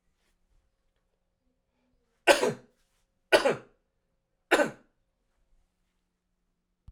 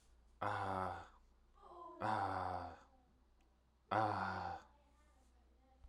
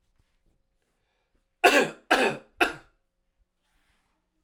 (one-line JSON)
{"three_cough_length": "6.9 s", "three_cough_amplitude": 17337, "three_cough_signal_mean_std_ratio": 0.22, "exhalation_length": "5.9 s", "exhalation_amplitude": 2510, "exhalation_signal_mean_std_ratio": 0.52, "cough_length": "4.4 s", "cough_amplitude": 20097, "cough_signal_mean_std_ratio": 0.28, "survey_phase": "alpha (2021-03-01 to 2021-08-12)", "age": "18-44", "gender": "Male", "wearing_mask": "No", "symptom_none": true, "smoker_status": "Never smoked", "respiratory_condition_asthma": false, "respiratory_condition_other": false, "recruitment_source": "Test and Trace", "submission_delay": "1 day", "covid_test_result": "Positive", "covid_test_method": "RT-qPCR", "covid_ct_value": 32.3, "covid_ct_gene": "ORF1ab gene", "covid_ct_mean": 33.1, "covid_viral_load": "14 copies/ml", "covid_viral_load_category": "Minimal viral load (< 10K copies/ml)"}